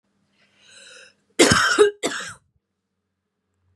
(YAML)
cough_length: 3.8 s
cough_amplitude: 30912
cough_signal_mean_std_ratio: 0.33
survey_phase: beta (2021-08-13 to 2022-03-07)
age: 18-44
gender: Female
wearing_mask: 'No'
symptom_cough_any: true
symptom_new_continuous_cough: true
symptom_runny_or_blocked_nose: true
symptom_onset: 5 days
smoker_status: Never smoked
respiratory_condition_asthma: false
respiratory_condition_other: false
recruitment_source: Test and Trace
submission_delay: 2 days
covid_test_result: Positive
covid_test_method: RT-qPCR
covid_ct_value: 30.5
covid_ct_gene: N gene